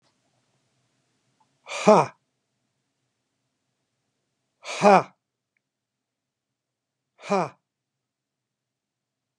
{
  "exhalation_length": "9.4 s",
  "exhalation_amplitude": 27300,
  "exhalation_signal_mean_std_ratio": 0.18,
  "survey_phase": "beta (2021-08-13 to 2022-03-07)",
  "age": "65+",
  "gender": "Male",
  "wearing_mask": "No",
  "symptom_none": true,
  "smoker_status": "Ex-smoker",
  "respiratory_condition_asthma": false,
  "respiratory_condition_other": false,
  "recruitment_source": "REACT",
  "submission_delay": "2 days",
  "covid_test_result": "Negative",
  "covid_test_method": "RT-qPCR",
  "influenza_a_test_result": "Negative",
  "influenza_b_test_result": "Negative"
}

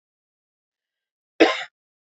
{
  "cough_length": "2.1 s",
  "cough_amplitude": 26327,
  "cough_signal_mean_std_ratio": 0.2,
  "survey_phase": "beta (2021-08-13 to 2022-03-07)",
  "age": "18-44",
  "gender": "Female",
  "wearing_mask": "No",
  "symptom_cough_any": true,
  "symptom_runny_or_blocked_nose": true,
  "symptom_abdominal_pain": true,
  "symptom_fatigue": true,
  "symptom_headache": true,
  "smoker_status": "Never smoked",
  "respiratory_condition_asthma": false,
  "respiratory_condition_other": false,
  "recruitment_source": "Test and Trace",
  "submission_delay": "2 days",
  "covid_test_result": "Positive",
  "covid_test_method": "RT-qPCR"
}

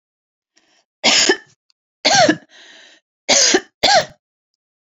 {
  "three_cough_length": "4.9 s",
  "three_cough_amplitude": 32768,
  "three_cough_signal_mean_std_ratio": 0.4,
  "survey_phase": "beta (2021-08-13 to 2022-03-07)",
  "age": "18-44",
  "gender": "Female",
  "wearing_mask": "No",
  "symptom_none": true,
  "smoker_status": "Never smoked",
  "respiratory_condition_asthma": false,
  "respiratory_condition_other": false,
  "recruitment_source": "REACT",
  "submission_delay": "1 day",
  "covid_test_result": "Negative",
  "covid_test_method": "RT-qPCR"
}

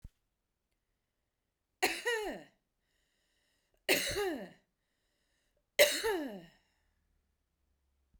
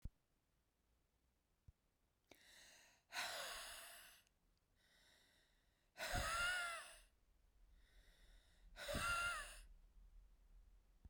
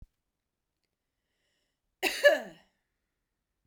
{
  "three_cough_length": "8.2 s",
  "three_cough_amplitude": 9288,
  "three_cough_signal_mean_std_ratio": 0.31,
  "exhalation_length": "11.1 s",
  "exhalation_amplitude": 917,
  "exhalation_signal_mean_std_ratio": 0.44,
  "cough_length": "3.7 s",
  "cough_amplitude": 13550,
  "cough_signal_mean_std_ratio": 0.2,
  "survey_phase": "beta (2021-08-13 to 2022-03-07)",
  "age": "18-44",
  "gender": "Female",
  "wearing_mask": "No",
  "symptom_none": true,
  "smoker_status": "Ex-smoker",
  "respiratory_condition_asthma": false,
  "respiratory_condition_other": false,
  "recruitment_source": "REACT",
  "submission_delay": "2 days",
  "covid_test_result": "Negative",
  "covid_test_method": "RT-qPCR"
}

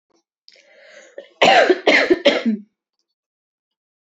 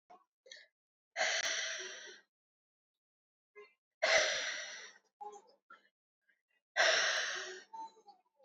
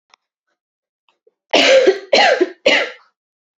{
  "cough_length": "4.0 s",
  "cough_amplitude": 29271,
  "cough_signal_mean_std_ratio": 0.39,
  "exhalation_length": "8.4 s",
  "exhalation_amplitude": 4869,
  "exhalation_signal_mean_std_ratio": 0.41,
  "three_cough_length": "3.6 s",
  "three_cough_amplitude": 30283,
  "three_cough_signal_mean_std_ratio": 0.44,
  "survey_phase": "beta (2021-08-13 to 2022-03-07)",
  "age": "18-44",
  "gender": "Female",
  "wearing_mask": "No",
  "symptom_cough_any": true,
  "symptom_runny_or_blocked_nose": true,
  "symptom_abdominal_pain": true,
  "symptom_fatigue": true,
  "symptom_headache": true,
  "symptom_change_to_sense_of_smell_or_taste": true,
  "symptom_loss_of_taste": true,
  "symptom_onset": "8 days",
  "smoker_status": "Never smoked",
  "respiratory_condition_asthma": false,
  "respiratory_condition_other": false,
  "recruitment_source": "Test and Trace",
  "submission_delay": "4 days",
  "covid_test_result": "Positive",
  "covid_test_method": "RT-qPCR",
  "covid_ct_value": 22.6,
  "covid_ct_gene": "ORF1ab gene",
  "covid_ct_mean": 23.2,
  "covid_viral_load": "24000 copies/ml",
  "covid_viral_load_category": "Low viral load (10K-1M copies/ml)"
}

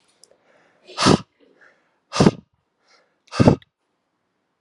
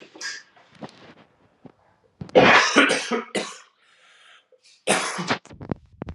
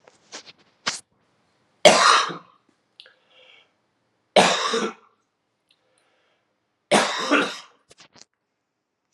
{
  "exhalation_length": "4.6 s",
  "exhalation_amplitude": 32767,
  "exhalation_signal_mean_std_ratio": 0.25,
  "cough_length": "6.1 s",
  "cough_amplitude": 29029,
  "cough_signal_mean_std_ratio": 0.37,
  "three_cough_length": "9.1 s",
  "three_cough_amplitude": 32768,
  "three_cough_signal_mean_std_ratio": 0.31,
  "survey_phase": "alpha (2021-03-01 to 2021-08-12)",
  "age": "18-44",
  "gender": "Male",
  "wearing_mask": "No",
  "symptom_cough_any": true,
  "symptom_new_continuous_cough": true,
  "symptom_fatigue": true,
  "symptom_change_to_sense_of_smell_or_taste": true,
  "symptom_loss_of_taste": true,
  "symptom_onset": "5 days",
  "smoker_status": "Never smoked",
  "respiratory_condition_asthma": false,
  "respiratory_condition_other": false,
  "recruitment_source": "Test and Trace",
  "submission_delay": "2 days",
  "covid_test_result": "Positive",
  "covid_test_method": "RT-qPCR",
  "covid_ct_value": 14.4,
  "covid_ct_gene": "ORF1ab gene",
  "covid_ct_mean": 14.8,
  "covid_viral_load": "14000000 copies/ml",
  "covid_viral_load_category": "High viral load (>1M copies/ml)"
}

